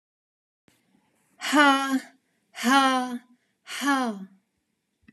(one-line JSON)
{"exhalation_length": "5.1 s", "exhalation_amplitude": 17059, "exhalation_signal_mean_std_ratio": 0.43, "survey_phase": "beta (2021-08-13 to 2022-03-07)", "age": "18-44", "gender": "Female", "wearing_mask": "No", "symptom_none": true, "smoker_status": "Never smoked", "respiratory_condition_asthma": false, "respiratory_condition_other": false, "recruitment_source": "REACT", "submission_delay": "9 days", "covid_test_result": "Negative", "covid_test_method": "RT-qPCR"}